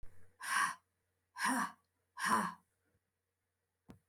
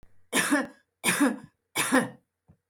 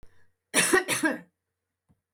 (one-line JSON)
{"exhalation_length": "4.1 s", "exhalation_amplitude": 3334, "exhalation_signal_mean_std_ratio": 0.42, "three_cough_length": "2.7 s", "three_cough_amplitude": 11195, "three_cough_signal_mean_std_ratio": 0.5, "cough_length": "2.1 s", "cough_amplitude": 12490, "cough_signal_mean_std_ratio": 0.41, "survey_phase": "alpha (2021-03-01 to 2021-08-12)", "age": "65+", "gender": "Female", "wearing_mask": "No", "symptom_none": true, "smoker_status": "Never smoked", "respiratory_condition_asthma": true, "respiratory_condition_other": false, "recruitment_source": "REACT", "submission_delay": "1 day", "covid_test_result": "Negative", "covid_test_method": "RT-qPCR"}